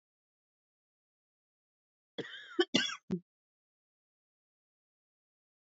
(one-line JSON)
{"cough_length": "5.6 s", "cough_amplitude": 8110, "cough_signal_mean_std_ratio": 0.2, "survey_phase": "beta (2021-08-13 to 2022-03-07)", "age": "18-44", "gender": "Female", "wearing_mask": "No", "symptom_cough_any": true, "symptom_headache": true, "smoker_status": "Ex-smoker", "respiratory_condition_asthma": false, "respiratory_condition_other": false, "recruitment_source": "REACT", "submission_delay": "1 day", "covid_test_result": "Negative", "covid_test_method": "RT-qPCR"}